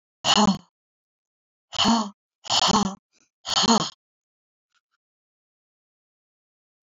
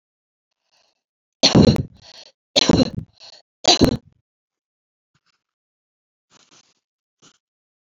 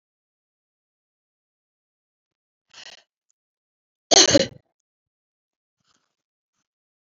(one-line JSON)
{"exhalation_length": "6.8 s", "exhalation_amplitude": 17253, "exhalation_signal_mean_std_ratio": 0.35, "three_cough_length": "7.9 s", "three_cough_amplitude": 32767, "three_cough_signal_mean_std_ratio": 0.26, "cough_length": "7.1 s", "cough_amplitude": 30300, "cough_signal_mean_std_ratio": 0.15, "survey_phase": "beta (2021-08-13 to 2022-03-07)", "age": "65+", "gender": "Female", "wearing_mask": "No", "symptom_none": true, "smoker_status": "Never smoked", "respiratory_condition_asthma": false, "respiratory_condition_other": false, "recruitment_source": "REACT", "submission_delay": "3 days", "covid_test_result": "Negative", "covid_test_method": "RT-qPCR", "influenza_a_test_result": "Negative", "influenza_b_test_result": "Negative"}